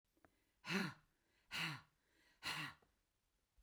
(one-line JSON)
{"exhalation_length": "3.6 s", "exhalation_amplitude": 1501, "exhalation_signal_mean_std_ratio": 0.39, "survey_phase": "beta (2021-08-13 to 2022-03-07)", "age": "65+", "gender": "Female", "wearing_mask": "No", "symptom_none": true, "smoker_status": "Ex-smoker", "respiratory_condition_asthma": false, "respiratory_condition_other": false, "recruitment_source": "REACT", "submission_delay": "1 day", "covid_test_result": "Negative", "covid_test_method": "RT-qPCR"}